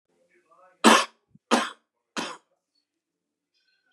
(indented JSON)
{
  "three_cough_length": "3.9 s",
  "three_cough_amplitude": 26560,
  "three_cough_signal_mean_std_ratio": 0.24,
  "survey_phase": "beta (2021-08-13 to 2022-03-07)",
  "age": "45-64",
  "gender": "Male",
  "wearing_mask": "No",
  "symptom_cough_any": true,
  "symptom_shortness_of_breath": true,
  "symptom_abdominal_pain": true,
  "symptom_fatigue": true,
  "smoker_status": "Ex-smoker",
  "respiratory_condition_asthma": false,
  "respiratory_condition_other": false,
  "recruitment_source": "REACT",
  "submission_delay": "1 day",
  "covid_test_result": "Negative",
  "covid_test_method": "RT-qPCR",
  "influenza_a_test_result": "Negative",
  "influenza_b_test_result": "Negative"
}